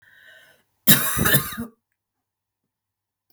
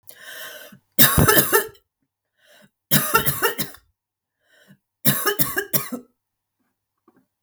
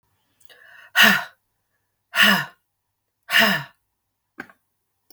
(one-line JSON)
{"cough_length": "3.3 s", "cough_amplitude": 32768, "cough_signal_mean_std_ratio": 0.31, "three_cough_length": "7.4 s", "three_cough_amplitude": 32768, "three_cough_signal_mean_std_ratio": 0.38, "exhalation_length": "5.1 s", "exhalation_amplitude": 32766, "exhalation_signal_mean_std_ratio": 0.32, "survey_phase": "beta (2021-08-13 to 2022-03-07)", "age": "45-64", "gender": "Female", "wearing_mask": "No", "symptom_none": true, "smoker_status": "Never smoked", "respiratory_condition_asthma": false, "respiratory_condition_other": false, "recruitment_source": "REACT", "submission_delay": "3 days", "covid_test_result": "Negative", "covid_test_method": "RT-qPCR", "influenza_a_test_result": "Negative", "influenza_b_test_result": "Negative"}